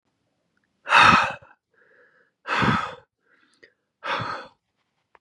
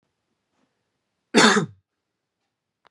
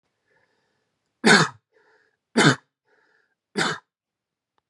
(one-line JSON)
{"exhalation_length": "5.2 s", "exhalation_amplitude": 24755, "exhalation_signal_mean_std_ratio": 0.33, "cough_length": "2.9 s", "cough_amplitude": 30716, "cough_signal_mean_std_ratio": 0.25, "three_cough_length": "4.7 s", "three_cough_amplitude": 25975, "three_cough_signal_mean_std_ratio": 0.27, "survey_phase": "beta (2021-08-13 to 2022-03-07)", "age": "18-44", "gender": "Male", "wearing_mask": "No", "symptom_none": true, "smoker_status": "Never smoked", "respiratory_condition_asthma": false, "respiratory_condition_other": false, "recruitment_source": "REACT", "submission_delay": "1 day", "covid_test_result": "Negative", "covid_test_method": "RT-qPCR", "influenza_a_test_result": "Negative", "influenza_b_test_result": "Negative"}